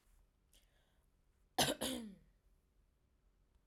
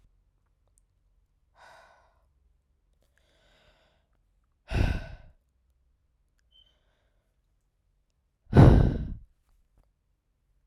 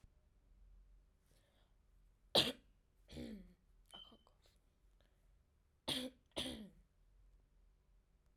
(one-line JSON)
{"cough_length": "3.7 s", "cough_amplitude": 3378, "cough_signal_mean_std_ratio": 0.27, "exhalation_length": "10.7 s", "exhalation_amplitude": 19962, "exhalation_signal_mean_std_ratio": 0.2, "three_cough_length": "8.4 s", "three_cough_amplitude": 4105, "three_cough_signal_mean_std_ratio": 0.26, "survey_phase": "alpha (2021-03-01 to 2021-08-12)", "age": "18-44", "gender": "Female", "wearing_mask": "No", "symptom_none": true, "smoker_status": "Never smoked", "respiratory_condition_asthma": false, "respiratory_condition_other": false, "recruitment_source": "REACT", "submission_delay": "1 day", "covid_test_result": "Negative", "covid_test_method": "RT-qPCR"}